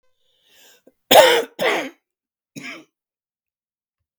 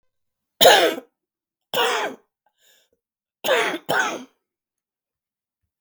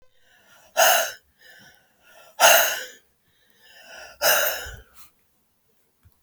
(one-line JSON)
{"cough_length": "4.2 s", "cough_amplitude": 32768, "cough_signal_mean_std_ratio": 0.27, "three_cough_length": "5.8 s", "three_cough_amplitude": 32768, "three_cough_signal_mean_std_ratio": 0.34, "exhalation_length": "6.2 s", "exhalation_amplitude": 30065, "exhalation_signal_mean_std_ratio": 0.34, "survey_phase": "beta (2021-08-13 to 2022-03-07)", "age": "65+", "gender": "Female", "wearing_mask": "No", "symptom_cough_any": true, "symptom_new_continuous_cough": true, "symptom_runny_or_blocked_nose": true, "symptom_shortness_of_breath": true, "symptom_sore_throat": true, "symptom_fatigue": true, "symptom_headache": true, "symptom_change_to_sense_of_smell_or_taste": true, "symptom_other": true, "symptom_onset": "3 days", "smoker_status": "Never smoked", "respiratory_condition_asthma": false, "respiratory_condition_other": false, "recruitment_source": "Test and Trace", "submission_delay": "2 days", "covid_test_result": "Positive", "covid_test_method": "RT-qPCR", "covid_ct_value": 17.8, "covid_ct_gene": "ORF1ab gene"}